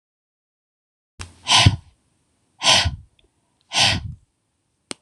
{"exhalation_length": "5.0 s", "exhalation_amplitude": 26028, "exhalation_signal_mean_std_ratio": 0.33, "survey_phase": "beta (2021-08-13 to 2022-03-07)", "age": "45-64", "gender": "Female", "wearing_mask": "No", "symptom_cough_any": true, "symptom_fatigue": true, "symptom_onset": "8 days", "smoker_status": "Never smoked", "respiratory_condition_asthma": false, "respiratory_condition_other": false, "recruitment_source": "REACT", "submission_delay": "1 day", "covid_test_result": "Negative", "covid_test_method": "RT-qPCR"}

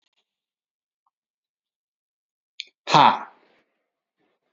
{"exhalation_length": "4.5 s", "exhalation_amplitude": 28019, "exhalation_signal_mean_std_ratio": 0.18, "survey_phase": "beta (2021-08-13 to 2022-03-07)", "age": "45-64", "gender": "Male", "wearing_mask": "No", "symptom_none": true, "smoker_status": "Ex-smoker", "respiratory_condition_asthma": false, "respiratory_condition_other": false, "recruitment_source": "REACT", "submission_delay": "2 days", "covid_test_result": "Negative", "covid_test_method": "RT-qPCR", "influenza_a_test_result": "Negative", "influenza_b_test_result": "Negative"}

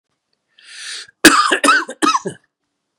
{"cough_length": "3.0 s", "cough_amplitude": 32768, "cough_signal_mean_std_ratio": 0.41, "survey_phase": "beta (2021-08-13 to 2022-03-07)", "age": "45-64", "gender": "Male", "wearing_mask": "No", "symptom_none": true, "smoker_status": "Never smoked", "respiratory_condition_asthma": false, "respiratory_condition_other": false, "recruitment_source": "REACT", "submission_delay": "4 days", "covid_test_result": "Negative", "covid_test_method": "RT-qPCR", "influenza_a_test_result": "Unknown/Void", "influenza_b_test_result": "Unknown/Void"}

